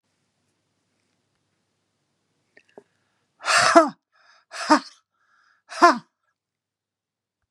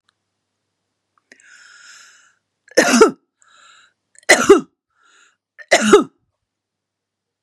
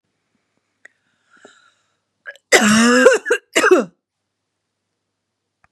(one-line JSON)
{"exhalation_length": "7.5 s", "exhalation_amplitude": 32645, "exhalation_signal_mean_std_ratio": 0.23, "three_cough_length": "7.4 s", "three_cough_amplitude": 32768, "three_cough_signal_mean_std_ratio": 0.27, "cough_length": "5.7 s", "cough_amplitude": 32768, "cough_signal_mean_std_ratio": 0.35, "survey_phase": "beta (2021-08-13 to 2022-03-07)", "age": "65+", "gender": "Female", "wearing_mask": "No", "symptom_none": true, "smoker_status": "Ex-smoker", "respiratory_condition_asthma": false, "respiratory_condition_other": false, "recruitment_source": "REACT", "submission_delay": "2 days", "covid_test_result": "Negative", "covid_test_method": "RT-qPCR", "influenza_a_test_result": "Negative", "influenza_b_test_result": "Negative"}